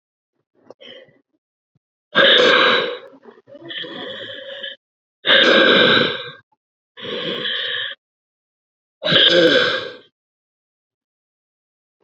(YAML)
exhalation_length: 12.0 s
exhalation_amplitude: 30268
exhalation_signal_mean_std_ratio: 0.44
survey_phase: beta (2021-08-13 to 2022-03-07)
age: 18-44
gender: Female
wearing_mask: 'No'
symptom_cough_any: true
symptom_runny_or_blocked_nose: true
symptom_sore_throat: true
symptom_fatigue: true
symptom_fever_high_temperature: true
symptom_change_to_sense_of_smell_or_taste: true
symptom_loss_of_taste: true
symptom_onset: 4 days
smoker_status: Never smoked
respiratory_condition_asthma: false
respiratory_condition_other: false
recruitment_source: Test and Trace
submission_delay: 3 days
covid_test_result: Positive
covid_test_method: ePCR